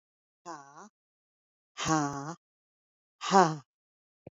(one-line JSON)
{"exhalation_length": "4.4 s", "exhalation_amplitude": 13585, "exhalation_signal_mean_std_ratio": 0.27, "survey_phase": "beta (2021-08-13 to 2022-03-07)", "age": "65+", "gender": "Female", "wearing_mask": "No", "symptom_none": true, "smoker_status": "Never smoked", "respiratory_condition_asthma": false, "respiratory_condition_other": false, "recruitment_source": "REACT", "submission_delay": "2 days", "covid_test_result": "Negative", "covid_test_method": "RT-qPCR", "influenza_a_test_result": "Negative", "influenza_b_test_result": "Negative"}